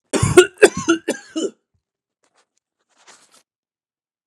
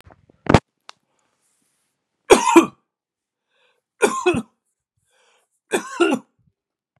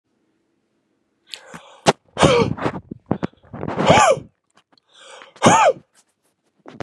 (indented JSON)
{
  "cough_length": "4.3 s",
  "cough_amplitude": 32768,
  "cough_signal_mean_std_ratio": 0.27,
  "three_cough_length": "7.0 s",
  "three_cough_amplitude": 32768,
  "three_cough_signal_mean_std_ratio": 0.27,
  "exhalation_length": "6.8 s",
  "exhalation_amplitude": 32768,
  "exhalation_signal_mean_std_ratio": 0.37,
  "survey_phase": "beta (2021-08-13 to 2022-03-07)",
  "age": "45-64",
  "gender": "Male",
  "wearing_mask": "No",
  "symptom_none": true,
  "smoker_status": "Never smoked",
  "respiratory_condition_asthma": false,
  "respiratory_condition_other": false,
  "recruitment_source": "REACT",
  "submission_delay": "1 day",
  "covid_test_result": "Negative",
  "covid_test_method": "RT-qPCR",
  "influenza_a_test_result": "Negative",
  "influenza_b_test_result": "Negative"
}